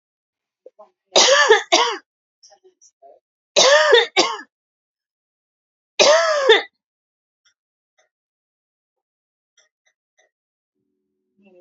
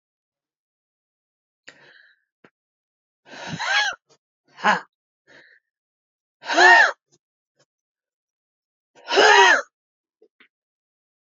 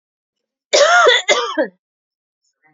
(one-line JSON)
{"three_cough_length": "11.6 s", "three_cough_amplitude": 32054, "three_cough_signal_mean_std_ratio": 0.33, "exhalation_length": "11.3 s", "exhalation_amplitude": 28058, "exhalation_signal_mean_std_ratio": 0.27, "cough_length": "2.7 s", "cough_amplitude": 29764, "cough_signal_mean_std_ratio": 0.45, "survey_phase": "beta (2021-08-13 to 2022-03-07)", "age": "18-44", "gender": "Female", "wearing_mask": "No", "symptom_fatigue": true, "symptom_headache": true, "smoker_status": "Ex-smoker", "respiratory_condition_asthma": false, "respiratory_condition_other": false, "recruitment_source": "REACT", "submission_delay": "1 day", "covid_test_result": "Negative", "covid_test_method": "RT-qPCR", "influenza_a_test_result": "Negative", "influenza_b_test_result": "Negative"}